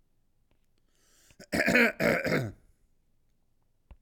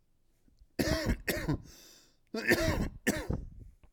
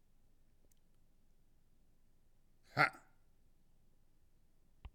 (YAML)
cough_length: 4.0 s
cough_amplitude: 11068
cough_signal_mean_std_ratio: 0.38
three_cough_length: 3.9 s
three_cough_amplitude: 8275
three_cough_signal_mean_std_ratio: 0.54
exhalation_length: 4.9 s
exhalation_amplitude: 4454
exhalation_signal_mean_std_ratio: 0.2
survey_phase: alpha (2021-03-01 to 2021-08-12)
age: 18-44
gender: Male
wearing_mask: 'Yes'
symptom_none: true
smoker_status: Ex-smoker
respiratory_condition_asthma: true
respiratory_condition_other: false
recruitment_source: REACT
submission_delay: 2 days
covid_test_result: Negative
covid_test_method: RT-qPCR